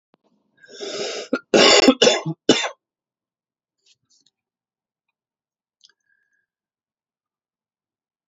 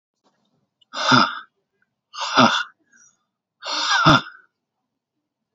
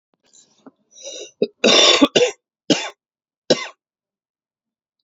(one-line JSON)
{"cough_length": "8.3 s", "cough_amplitude": 30408, "cough_signal_mean_std_ratio": 0.26, "exhalation_length": "5.5 s", "exhalation_amplitude": 30303, "exhalation_signal_mean_std_ratio": 0.36, "three_cough_length": "5.0 s", "three_cough_amplitude": 32767, "three_cough_signal_mean_std_ratio": 0.33, "survey_phase": "alpha (2021-03-01 to 2021-08-12)", "age": "18-44", "gender": "Male", "wearing_mask": "No", "symptom_cough_any": true, "symptom_new_continuous_cough": true, "symptom_shortness_of_breath": true, "symptom_fatigue": true, "symptom_headache": true, "symptom_onset": "3 days", "smoker_status": "Current smoker (e-cigarettes or vapes only)", "respiratory_condition_asthma": true, "respiratory_condition_other": false, "recruitment_source": "Test and Trace", "submission_delay": "1 day", "covid_test_result": "Positive", "covid_test_method": "RT-qPCR"}